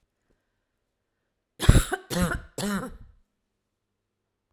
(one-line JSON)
{"three_cough_length": "4.5 s", "three_cough_amplitude": 32767, "three_cough_signal_mean_std_ratio": 0.27, "survey_phase": "alpha (2021-03-01 to 2021-08-12)", "age": "45-64", "gender": "Female", "wearing_mask": "No", "symptom_none": true, "smoker_status": "Never smoked", "respiratory_condition_asthma": false, "respiratory_condition_other": false, "recruitment_source": "REACT", "submission_delay": "2 days", "covid_test_result": "Negative", "covid_test_method": "RT-qPCR"}